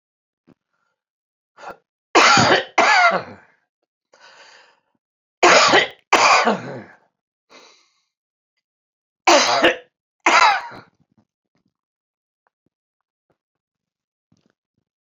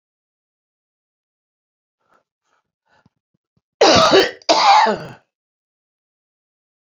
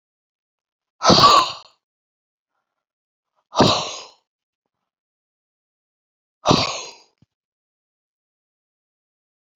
three_cough_length: 15.2 s
three_cough_amplitude: 32767
three_cough_signal_mean_std_ratio: 0.34
cough_length: 6.8 s
cough_amplitude: 32767
cough_signal_mean_std_ratio: 0.31
exhalation_length: 9.6 s
exhalation_amplitude: 32768
exhalation_signal_mean_std_ratio: 0.25
survey_phase: beta (2021-08-13 to 2022-03-07)
age: 65+
gender: Male
wearing_mask: 'No'
symptom_cough_any: true
symptom_fatigue: true
symptom_onset: 13 days
smoker_status: Ex-smoker
respiratory_condition_asthma: false
respiratory_condition_other: false
recruitment_source: REACT
submission_delay: 2 days
covid_test_result: Negative
covid_test_method: RT-qPCR
influenza_a_test_result: Negative
influenza_b_test_result: Negative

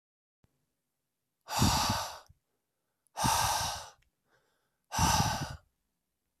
exhalation_length: 6.4 s
exhalation_amplitude: 6956
exhalation_signal_mean_std_ratio: 0.43
survey_phase: beta (2021-08-13 to 2022-03-07)
age: 18-44
gender: Male
wearing_mask: 'No'
symptom_none: true
smoker_status: Never smoked
respiratory_condition_asthma: true
respiratory_condition_other: false
recruitment_source: REACT
submission_delay: 1 day
covid_test_result: Negative
covid_test_method: RT-qPCR
influenza_a_test_result: Negative
influenza_b_test_result: Negative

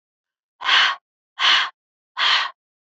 exhalation_length: 2.9 s
exhalation_amplitude: 22800
exhalation_signal_mean_std_ratio: 0.46
survey_phase: beta (2021-08-13 to 2022-03-07)
age: 45-64
gender: Female
wearing_mask: 'No'
symptom_change_to_sense_of_smell_or_taste: true
symptom_onset: 12 days
smoker_status: Never smoked
respiratory_condition_asthma: false
respiratory_condition_other: false
recruitment_source: REACT
submission_delay: 1 day
covid_test_result: Negative
covid_test_method: RT-qPCR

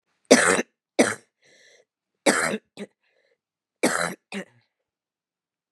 three_cough_length: 5.7 s
three_cough_amplitude: 32321
three_cough_signal_mean_std_ratio: 0.3
survey_phase: beta (2021-08-13 to 2022-03-07)
age: 45-64
gender: Female
wearing_mask: 'No'
symptom_new_continuous_cough: true
symptom_runny_or_blocked_nose: true
symptom_shortness_of_breath: true
symptom_fatigue: true
symptom_fever_high_temperature: true
symptom_headache: true
symptom_onset: 3 days
smoker_status: Never smoked
respiratory_condition_asthma: false
respiratory_condition_other: false
recruitment_source: Test and Trace
submission_delay: 1 day
covid_test_result: Positive
covid_test_method: ePCR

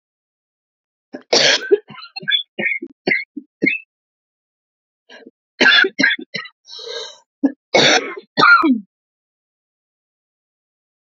cough_length: 11.2 s
cough_amplitude: 32767
cough_signal_mean_std_ratio: 0.38
survey_phase: beta (2021-08-13 to 2022-03-07)
age: 45-64
gender: Female
wearing_mask: 'No'
symptom_cough_any: true
symptom_shortness_of_breath: true
symptom_abdominal_pain: true
symptom_fatigue: true
symptom_fever_high_temperature: true
symptom_headache: true
symptom_change_to_sense_of_smell_or_taste: true
symptom_onset: 3 days
smoker_status: Never smoked
respiratory_condition_asthma: false
respiratory_condition_other: false
recruitment_source: Test and Trace
submission_delay: 1 day
covid_test_result: Positive
covid_test_method: RT-qPCR
covid_ct_value: 23.1
covid_ct_gene: N gene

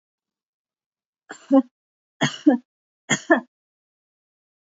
three_cough_length: 4.7 s
three_cough_amplitude: 30444
three_cough_signal_mean_std_ratio: 0.25
survey_phase: beta (2021-08-13 to 2022-03-07)
age: 65+
gender: Female
wearing_mask: 'No'
symptom_none: true
smoker_status: Never smoked
respiratory_condition_asthma: false
respiratory_condition_other: false
recruitment_source: REACT
submission_delay: 2 days
covid_test_result: Negative
covid_test_method: RT-qPCR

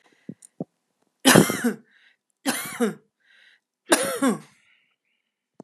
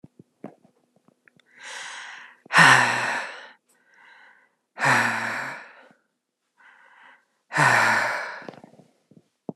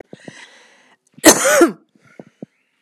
three_cough_length: 5.6 s
three_cough_amplitude: 32768
three_cough_signal_mean_std_ratio: 0.32
exhalation_length: 9.6 s
exhalation_amplitude: 30684
exhalation_signal_mean_std_ratio: 0.38
cough_length: 2.8 s
cough_amplitude: 32768
cough_signal_mean_std_ratio: 0.32
survey_phase: alpha (2021-03-01 to 2021-08-12)
age: 45-64
gender: Female
wearing_mask: 'No'
symptom_none: true
smoker_status: Never smoked
respiratory_condition_asthma: false
respiratory_condition_other: false
recruitment_source: REACT
submission_delay: 2 days
covid_test_result: Negative
covid_test_method: RT-qPCR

